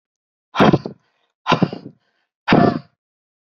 {"exhalation_length": "3.4 s", "exhalation_amplitude": 28084, "exhalation_signal_mean_std_ratio": 0.35, "survey_phase": "beta (2021-08-13 to 2022-03-07)", "age": "18-44", "gender": "Female", "wearing_mask": "No", "symptom_runny_or_blocked_nose": true, "symptom_fatigue": true, "symptom_onset": "6 days", "smoker_status": "Never smoked", "respiratory_condition_asthma": false, "respiratory_condition_other": false, "recruitment_source": "REACT", "submission_delay": "0 days", "covid_test_result": "Negative", "covid_test_method": "RT-qPCR", "influenza_a_test_result": "Negative", "influenza_b_test_result": "Negative"}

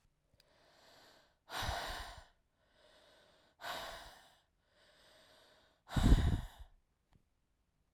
{"exhalation_length": "7.9 s", "exhalation_amplitude": 6381, "exhalation_signal_mean_std_ratio": 0.28, "survey_phase": "alpha (2021-03-01 to 2021-08-12)", "age": "45-64", "gender": "Female", "wearing_mask": "No", "symptom_cough_any": true, "symptom_new_continuous_cough": true, "symptom_fatigue": true, "symptom_headache": true, "symptom_onset": "2 days", "smoker_status": "Ex-smoker", "respiratory_condition_asthma": false, "respiratory_condition_other": false, "recruitment_source": "Test and Trace", "submission_delay": "1 day", "covid_test_result": "Positive", "covid_test_method": "RT-qPCR", "covid_ct_value": 18.2, "covid_ct_gene": "ORF1ab gene", "covid_ct_mean": 18.7, "covid_viral_load": "730000 copies/ml", "covid_viral_load_category": "Low viral load (10K-1M copies/ml)"}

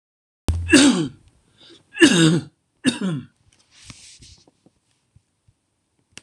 {"cough_length": "6.2 s", "cough_amplitude": 26028, "cough_signal_mean_std_ratio": 0.35, "survey_phase": "alpha (2021-03-01 to 2021-08-12)", "age": "65+", "gender": "Male", "wearing_mask": "No", "symptom_none": true, "smoker_status": "Ex-smoker", "respiratory_condition_asthma": false, "respiratory_condition_other": false, "recruitment_source": "REACT", "submission_delay": "1 day", "covid_test_result": "Negative", "covid_test_method": "RT-qPCR"}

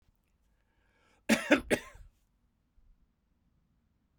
{"cough_length": "4.2 s", "cough_amplitude": 10178, "cough_signal_mean_std_ratio": 0.22, "survey_phase": "beta (2021-08-13 to 2022-03-07)", "age": "45-64", "gender": "Male", "wearing_mask": "No", "symptom_cough_any": true, "symptom_runny_or_blocked_nose": true, "symptom_sore_throat": true, "symptom_fatigue": true, "symptom_headache": true, "symptom_change_to_sense_of_smell_or_taste": true, "symptom_loss_of_taste": true, "symptom_onset": "6 days", "smoker_status": "Ex-smoker", "respiratory_condition_asthma": false, "respiratory_condition_other": false, "recruitment_source": "Test and Trace", "submission_delay": "1 day", "covid_test_result": "Positive", "covid_test_method": "ePCR"}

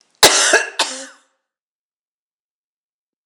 {"cough_length": "3.3 s", "cough_amplitude": 26028, "cough_signal_mean_std_ratio": 0.31, "survey_phase": "beta (2021-08-13 to 2022-03-07)", "age": "45-64", "gender": "Female", "wearing_mask": "No", "symptom_cough_any": true, "symptom_shortness_of_breath": true, "symptom_fatigue": true, "symptom_headache": true, "symptom_onset": "3 days", "smoker_status": "Never smoked", "respiratory_condition_asthma": true, "respiratory_condition_other": false, "recruitment_source": "Test and Trace", "submission_delay": "2 days", "covid_test_result": "Positive", "covid_test_method": "RT-qPCR", "covid_ct_value": 14.6, "covid_ct_gene": "ORF1ab gene", "covid_ct_mean": 14.9, "covid_viral_load": "13000000 copies/ml", "covid_viral_load_category": "High viral load (>1M copies/ml)"}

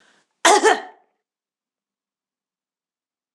{"cough_length": "3.3 s", "cough_amplitude": 26027, "cough_signal_mean_std_ratio": 0.24, "survey_phase": "beta (2021-08-13 to 2022-03-07)", "age": "45-64", "gender": "Female", "wearing_mask": "No", "symptom_runny_or_blocked_nose": true, "symptom_onset": "3 days", "smoker_status": "Never smoked", "respiratory_condition_asthma": false, "respiratory_condition_other": false, "recruitment_source": "Test and Trace", "submission_delay": "2 days", "covid_test_result": "Positive", "covid_test_method": "ePCR"}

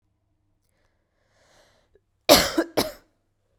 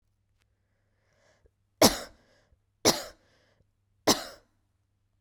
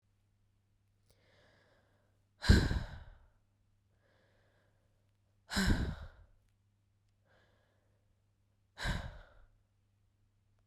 {"cough_length": "3.6 s", "cough_amplitude": 32767, "cough_signal_mean_std_ratio": 0.23, "three_cough_length": "5.2 s", "three_cough_amplitude": 22555, "three_cough_signal_mean_std_ratio": 0.2, "exhalation_length": "10.7 s", "exhalation_amplitude": 8600, "exhalation_signal_mean_std_ratio": 0.24, "survey_phase": "beta (2021-08-13 to 2022-03-07)", "age": "18-44", "gender": "Female", "wearing_mask": "No", "symptom_cough_any": true, "symptom_sore_throat": true, "symptom_fatigue": true, "symptom_headache": true, "symptom_other": true, "symptom_onset": "4 days", "smoker_status": "Never smoked", "respiratory_condition_asthma": false, "respiratory_condition_other": false, "recruitment_source": "Test and Trace", "submission_delay": "2 days", "covid_test_result": "Positive", "covid_test_method": "ePCR"}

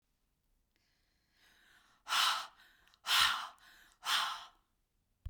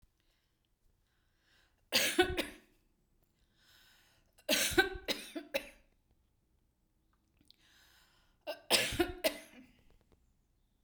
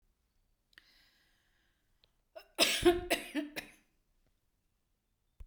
{"exhalation_length": "5.3 s", "exhalation_amplitude": 5740, "exhalation_signal_mean_std_ratio": 0.37, "three_cough_length": "10.8 s", "three_cough_amplitude": 7585, "three_cough_signal_mean_std_ratio": 0.31, "cough_length": "5.5 s", "cough_amplitude": 8628, "cough_signal_mean_std_ratio": 0.27, "survey_phase": "beta (2021-08-13 to 2022-03-07)", "age": "65+", "gender": "Female", "wearing_mask": "No", "symptom_none": true, "smoker_status": "Ex-smoker", "respiratory_condition_asthma": false, "respiratory_condition_other": false, "recruitment_source": "REACT", "submission_delay": "2 days", "covid_test_result": "Negative", "covid_test_method": "RT-qPCR", "influenza_a_test_result": "Negative", "influenza_b_test_result": "Negative"}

